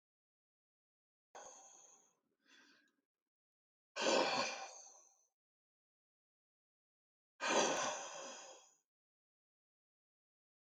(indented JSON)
{
  "exhalation_length": "10.8 s",
  "exhalation_amplitude": 2931,
  "exhalation_signal_mean_std_ratio": 0.3,
  "survey_phase": "beta (2021-08-13 to 2022-03-07)",
  "age": "45-64",
  "gender": "Male",
  "wearing_mask": "No",
  "symptom_cough_any": true,
  "symptom_runny_or_blocked_nose": true,
  "symptom_onset": "8 days",
  "smoker_status": "Never smoked",
  "respiratory_condition_asthma": false,
  "respiratory_condition_other": false,
  "recruitment_source": "REACT",
  "submission_delay": "1 day",
  "covid_test_result": "Negative",
  "covid_test_method": "RT-qPCR",
  "influenza_a_test_result": "Negative",
  "influenza_b_test_result": "Negative"
}